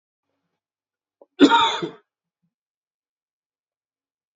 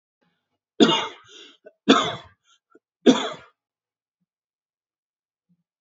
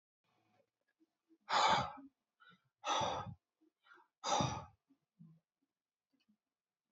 {"cough_length": "4.4 s", "cough_amplitude": 27136, "cough_signal_mean_std_ratio": 0.22, "three_cough_length": "5.8 s", "three_cough_amplitude": 29969, "three_cough_signal_mean_std_ratio": 0.25, "exhalation_length": "6.9 s", "exhalation_amplitude": 3382, "exhalation_signal_mean_std_ratio": 0.33, "survey_phase": "beta (2021-08-13 to 2022-03-07)", "age": "18-44", "gender": "Male", "wearing_mask": "No", "symptom_cough_any": true, "symptom_runny_or_blocked_nose": true, "symptom_sore_throat": true, "symptom_onset": "6 days", "smoker_status": "Current smoker (11 or more cigarettes per day)", "respiratory_condition_asthma": false, "respiratory_condition_other": false, "recruitment_source": "REACT", "submission_delay": "0 days", "covid_test_result": "Negative", "covid_test_method": "RT-qPCR", "influenza_a_test_result": "Negative", "influenza_b_test_result": "Negative"}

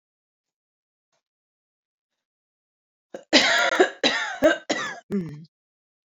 {"three_cough_length": "6.1 s", "three_cough_amplitude": 27155, "three_cough_signal_mean_std_ratio": 0.36, "survey_phase": "beta (2021-08-13 to 2022-03-07)", "age": "18-44", "gender": "Female", "wearing_mask": "No", "symptom_none": true, "symptom_onset": "12 days", "smoker_status": "Never smoked", "respiratory_condition_asthma": true, "respiratory_condition_other": false, "recruitment_source": "REACT", "submission_delay": "1 day", "covid_test_result": "Negative", "covid_test_method": "RT-qPCR"}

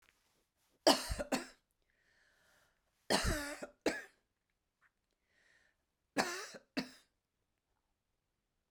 {"three_cough_length": "8.7 s", "three_cough_amplitude": 8337, "three_cough_signal_mean_std_ratio": 0.27, "survey_phase": "beta (2021-08-13 to 2022-03-07)", "age": "65+", "gender": "Female", "wearing_mask": "No", "symptom_none": true, "smoker_status": "Ex-smoker", "respiratory_condition_asthma": false, "respiratory_condition_other": false, "recruitment_source": "REACT", "submission_delay": "3 days", "covid_test_result": "Negative", "covid_test_method": "RT-qPCR"}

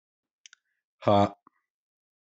{"exhalation_length": "2.4 s", "exhalation_amplitude": 12802, "exhalation_signal_mean_std_ratio": 0.23, "survey_phase": "alpha (2021-03-01 to 2021-08-12)", "age": "45-64", "gender": "Male", "wearing_mask": "No", "symptom_none": true, "smoker_status": "Ex-smoker", "respiratory_condition_asthma": false, "respiratory_condition_other": false, "recruitment_source": "REACT", "submission_delay": "2 days", "covid_test_result": "Negative", "covid_test_method": "RT-qPCR"}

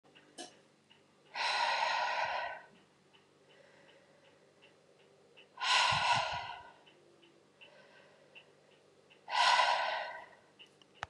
{"exhalation_length": "11.1 s", "exhalation_amplitude": 5531, "exhalation_signal_mean_std_ratio": 0.45, "survey_phase": "beta (2021-08-13 to 2022-03-07)", "age": "45-64", "gender": "Female", "wearing_mask": "No", "symptom_cough_any": true, "symptom_runny_or_blocked_nose": true, "symptom_fatigue": true, "symptom_headache": true, "symptom_change_to_sense_of_smell_or_taste": true, "symptom_onset": "3 days", "smoker_status": "Never smoked", "respiratory_condition_asthma": false, "respiratory_condition_other": false, "recruitment_source": "Test and Trace", "submission_delay": "2 days", "covid_test_result": "Positive", "covid_test_method": "RT-qPCR", "covid_ct_value": 25.4, "covid_ct_gene": "ORF1ab gene"}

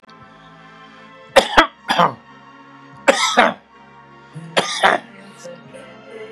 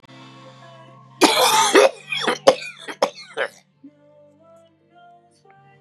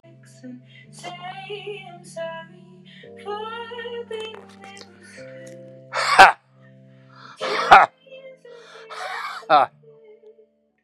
{"three_cough_length": "6.3 s", "three_cough_amplitude": 32768, "three_cough_signal_mean_std_ratio": 0.36, "cough_length": "5.8 s", "cough_amplitude": 32768, "cough_signal_mean_std_ratio": 0.37, "exhalation_length": "10.8 s", "exhalation_amplitude": 32768, "exhalation_signal_mean_std_ratio": 0.3, "survey_phase": "beta (2021-08-13 to 2022-03-07)", "age": "65+", "gender": "Male", "wearing_mask": "No", "symptom_cough_any": true, "symptom_runny_or_blocked_nose": true, "symptom_sore_throat": true, "symptom_fatigue": true, "symptom_fever_high_temperature": true, "symptom_change_to_sense_of_smell_or_taste": true, "symptom_loss_of_taste": true, "smoker_status": "Ex-smoker", "respiratory_condition_asthma": false, "respiratory_condition_other": false, "recruitment_source": "Test and Trace", "submission_delay": "1 day", "covid_test_result": "Positive", "covid_test_method": "RT-qPCR", "covid_ct_value": 18.6, "covid_ct_gene": "ORF1ab gene", "covid_ct_mean": 19.0, "covid_viral_load": "600000 copies/ml", "covid_viral_load_category": "Low viral load (10K-1M copies/ml)"}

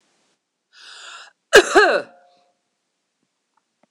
{"cough_length": "3.9 s", "cough_amplitude": 26028, "cough_signal_mean_std_ratio": 0.25, "survey_phase": "beta (2021-08-13 to 2022-03-07)", "age": "65+", "gender": "Female", "wearing_mask": "No", "symptom_cough_any": true, "symptom_runny_or_blocked_nose": true, "symptom_fatigue": true, "symptom_headache": true, "symptom_onset": "2 days", "smoker_status": "Never smoked", "respiratory_condition_asthma": false, "respiratory_condition_other": false, "recruitment_source": "Test and Trace", "submission_delay": "2 days", "covid_test_result": "Positive", "covid_test_method": "RT-qPCR", "covid_ct_value": 34.2, "covid_ct_gene": "ORF1ab gene", "covid_ct_mean": 35.7, "covid_viral_load": "2 copies/ml", "covid_viral_load_category": "Minimal viral load (< 10K copies/ml)"}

